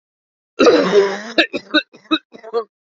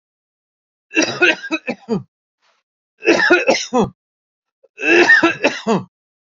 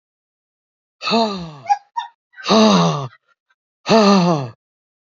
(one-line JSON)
{"cough_length": "3.0 s", "cough_amplitude": 28883, "cough_signal_mean_std_ratio": 0.47, "three_cough_length": "6.4 s", "three_cough_amplitude": 29116, "three_cough_signal_mean_std_ratio": 0.46, "exhalation_length": "5.1 s", "exhalation_amplitude": 29579, "exhalation_signal_mean_std_ratio": 0.47, "survey_phase": "beta (2021-08-13 to 2022-03-07)", "age": "65+", "gender": "Male", "wearing_mask": "No", "symptom_cough_any": true, "smoker_status": "Never smoked", "respiratory_condition_asthma": false, "respiratory_condition_other": false, "recruitment_source": "REACT", "submission_delay": "3 days", "covid_test_result": "Negative", "covid_test_method": "RT-qPCR", "influenza_a_test_result": "Negative", "influenza_b_test_result": "Negative"}